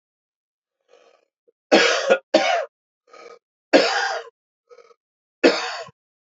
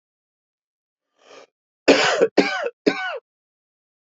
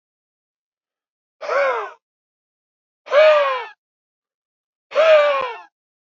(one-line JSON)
{"three_cough_length": "6.3 s", "three_cough_amplitude": 28047, "three_cough_signal_mean_std_ratio": 0.36, "cough_length": "4.0 s", "cough_amplitude": 28448, "cough_signal_mean_std_ratio": 0.35, "exhalation_length": "6.1 s", "exhalation_amplitude": 23684, "exhalation_signal_mean_std_ratio": 0.4, "survey_phase": "beta (2021-08-13 to 2022-03-07)", "age": "18-44", "gender": "Male", "wearing_mask": "No", "symptom_cough_any": true, "symptom_shortness_of_breath": true, "symptom_sore_throat": true, "symptom_diarrhoea": true, "symptom_fever_high_temperature": true, "symptom_headache": true, "symptom_onset": "3 days", "smoker_status": "Never smoked", "respiratory_condition_asthma": true, "respiratory_condition_other": false, "recruitment_source": "Test and Trace", "submission_delay": "1 day", "covid_test_result": "Positive", "covid_test_method": "ePCR"}